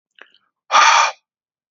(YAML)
exhalation_length: 1.7 s
exhalation_amplitude: 29774
exhalation_signal_mean_std_ratio: 0.4
survey_phase: alpha (2021-03-01 to 2021-08-12)
age: 45-64
gender: Male
wearing_mask: 'No'
symptom_none: true
smoker_status: Never smoked
respiratory_condition_asthma: false
respiratory_condition_other: false
recruitment_source: REACT
submission_delay: 3 days
covid_test_result: Negative
covid_test_method: RT-qPCR